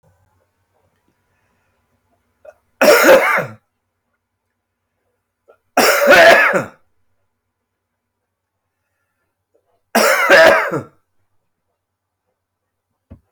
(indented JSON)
{
  "three_cough_length": "13.3 s",
  "three_cough_amplitude": 32739,
  "three_cough_signal_mean_std_ratio": 0.34,
  "survey_phase": "beta (2021-08-13 to 2022-03-07)",
  "age": "45-64",
  "gender": "Male",
  "wearing_mask": "No",
  "symptom_cough_any": true,
  "symptom_shortness_of_breath": true,
  "symptom_fatigue": true,
  "symptom_change_to_sense_of_smell_or_taste": true,
  "symptom_onset": "6 days",
  "smoker_status": "Never smoked",
  "respiratory_condition_asthma": false,
  "respiratory_condition_other": false,
  "recruitment_source": "Test and Trace",
  "submission_delay": "1 day",
  "covid_test_result": "Positive",
  "covid_test_method": "RT-qPCR",
  "covid_ct_value": 21.4,
  "covid_ct_gene": "ORF1ab gene",
  "covid_ct_mean": 22.1,
  "covid_viral_load": "56000 copies/ml",
  "covid_viral_load_category": "Low viral load (10K-1M copies/ml)"
}